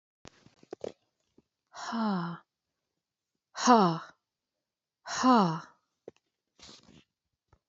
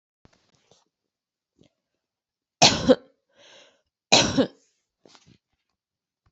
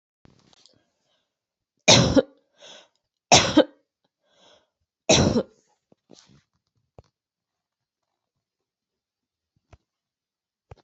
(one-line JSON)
{"exhalation_length": "7.7 s", "exhalation_amplitude": 14114, "exhalation_signal_mean_std_ratio": 0.31, "cough_length": "6.3 s", "cough_amplitude": 27941, "cough_signal_mean_std_ratio": 0.22, "three_cough_length": "10.8 s", "three_cough_amplitude": 27165, "three_cough_signal_mean_std_ratio": 0.22, "survey_phase": "beta (2021-08-13 to 2022-03-07)", "age": "18-44", "gender": "Female", "wearing_mask": "No", "symptom_cough_any": true, "smoker_status": "Never smoked", "respiratory_condition_asthma": false, "respiratory_condition_other": false, "recruitment_source": "REACT", "submission_delay": "3 days", "covid_test_result": "Negative", "covid_test_method": "RT-qPCR", "influenza_a_test_result": "Unknown/Void", "influenza_b_test_result": "Unknown/Void"}